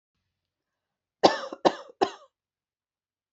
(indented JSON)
{
  "three_cough_length": "3.3 s",
  "three_cough_amplitude": 24423,
  "three_cough_signal_mean_std_ratio": 0.21,
  "survey_phase": "beta (2021-08-13 to 2022-03-07)",
  "age": "18-44",
  "gender": "Female",
  "wearing_mask": "No",
  "symptom_none": true,
  "smoker_status": "Ex-smoker",
  "respiratory_condition_asthma": false,
  "respiratory_condition_other": false,
  "recruitment_source": "REACT",
  "submission_delay": "2 days",
  "covid_test_result": "Negative",
  "covid_test_method": "RT-qPCR"
}